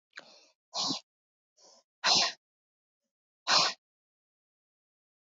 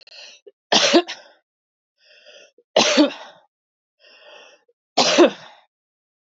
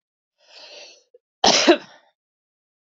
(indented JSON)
{
  "exhalation_length": "5.2 s",
  "exhalation_amplitude": 10867,
  "exhalation_signal_mean_std_ratio": 0.29,
  "three_cough_length": "6.3 s",
  "three_cough_amplitude": 26670,
  "three_cough_signal_mean_std_ratio": 0.33,
  "cough_length": "2.8 s",
  "cough_amplitude": 27681,
  "cough_signal_mean_std_ratio": 0.27,
  "survey_phase": "beta (2021-08-13 to 2022-03-07)",
  "age": "18-44",
  "gender": "Female",
  "wearing_mask": "No",
  "symptom_cough_any": true,
  "smoker_status": "Ex-smoker",
  "respiratory_condition_asthma": false,
  "respiratory_condition_other": false,
  "recruitment_source": "REACT",
  "submission_delay": "2 days",
  "covid_test_result": "Negative",
  "covid_test_method": "RT-qPCR",
  "influenza_a_test_result": "Negative",
  "influenza_b_test_result": "Negative"
}